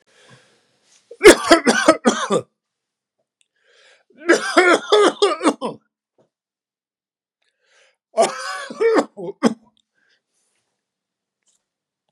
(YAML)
three_cough_length: 12.1 s
three_cough_amplitude: 32768
three_cough_signal_mean_std_ratio: 0.33
survey_phase: beta (2021-08-13 to 2022-03-07)
age: 65+
gender: Male
wearing_mask: 'No'
symptom_none: true
smoker_status: Ex-smoker
respiratory_condition_asthma: false
respiratory_condition_other: false
recruitment_source: REACT
submission_delay: 2 days
covid_test_result: Negative
covid_test_method: RT-qPCR
influenza_a_test_result: Negative
influenza_b_test_result: Negative